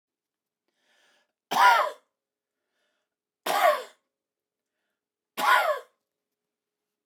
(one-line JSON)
{"three_cough_length": "7.1 s", "three_cough_amplitude": 15923, "three_cough_signal_mean_std_ratio": 0.3, "survey_phase": "beta (2021-08-13 to 2022-03-07)", "age": "45-64", "gender": "Male", "wearing_mask": "No", "symptom_none": true, "smoker_status": "Never smoked", "respiratory_condition_asthma": true, "respiratory_condition_other": false, "recruitment_source": "REACT", "submission_delay": "0 days", "covid_test_result": "Negative", "covid_test_method": "RT-qPCR"}